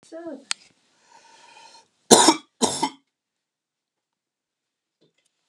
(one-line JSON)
{"cough_length": "5.5 s", "cough_amplitude": 32768, "cough_signal_mean_std_ratio": 0.22, "survey_phase": "beta (2021-08-13 to 2022-03-07)", "age": "45-64", "gender": "Male", "wearing_mask": "No", "symptom_none": true, "smoker_status": "Never smoked", "respiratory_condition_asthma": false, "respiratory_condition_other": false, "recruitment_source": "REACT", "submission_delay": "2 days", "covid_test_result": "Negative", "covid_test_method": "RT-qPCR"}